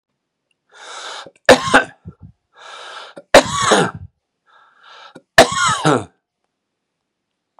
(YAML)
three_cough_length: 7.6 s
three_cough_amplitude: 32768
three_cough_signal_mean_std_ratio: 0.32
survey_phase: beta (2021-08-13 to 2022-03-07)
age: 65+
gender: Male
wearing_mask: 'No'
symptom_runny_or_blocked_nose: true
symptom_fatigue: true
symptom_headache: true
symptom_onset: 3 days
smoker_status: Never smoked
respiratory_condition_asthma: false
respiratory_condition_other: false
recruitment_source: Test and Trace
submission_delay: 2 days
covid_test_result: Positive
covid_test_method: RT-qPCR
covid_ct_value: 27.6
covid_ct_gene: N gene
covid_ct_mean: 27.7
covid_viral_load: 850 copies/ml
covid_viral_load_category: Minimal viral load (< 10K copies/ml)